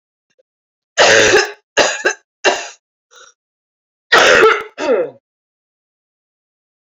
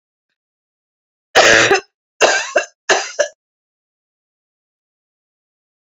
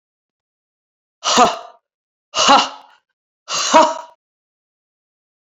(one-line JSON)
{"three_cough_length": "6.9 s", "three_cough_amplitude": 32639, "three_cough_signal_mean_std_ratio": 0.41, "cough_length": "5.8 s", "cough_amplitude": 32768, "cough_signal_mean_std_ratio": 0.33, "exhalation_length": "5.5 s", "exhalation_amplitude": 28960, "exhalation_signal_mean_std_ratio": 0.33, "survey_phase": "beta (2021-08-13 to 2022-03-07)", "age": "45-64", "gender": "Female", "wearing_mask": "No", "symptom_cough_any": true, "symptom_new_continuous_cough": true, "symptom_runny_or_blocked_nose": true, "symptom_fatigue": true, "symptom_fever_high_temperature": true, "symptom_headache": true, "symptom_onset": "4 days", "smoker_status": "Never smoked", "respiratory_condition_asthma": false, "respiratory_condition_other": false, "recruitment_source": "Test and Trace", "submission_delay": "2 days", "covid_test_result": "Positive", "covid_test_method": "RT-qPCR", "covid_ct_value": 16.1, "covid_ct_gene": "ORF1ab gene", "covid_ct_mean": 16.4, "covid_viral_load": "4100000 copies/ml", "covid_viral_load_category": "High viral load (>1M copies/ml)"}